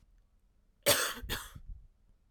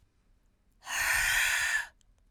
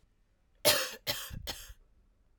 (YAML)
cough_length: 2.3 s
cough_amplitude: 9069
cough_signal_mean_std_ratio: 0.37
exhalation_length: 2.3 s
exhalation_amplitude: 5077
exhalation_signal_mean_std_ratio: 0.6
three_cough_length: 2.4 s
three_cough_amplitude: 10280
three_cough_signal_mean_std_ratio: 0.36
survey_phase: alpha (2021-03-01 to 2021-08-12)
age: 18-44
gender: Female
wearing_mask: 'No'
symptom_cough_any: true
symptom_headache: true
symptom_onset: 4 days
smoker_status: Never smoked
respiratory_condition_asthma: false
respiratory_condition_other: false
recruitment_source: Test and Trace
submission_delay: 2 days
covid_test_result: Positive
covid_test_method: RT-qPCR
covid_ct_value: 19.3
covid_ct_gene: ORF1ab gene
covid_ct_mean: 19.6
covid_viral_load: 370000 copies/ml
covid_viral_load_category: Low viral load (10K-1M copies/ml)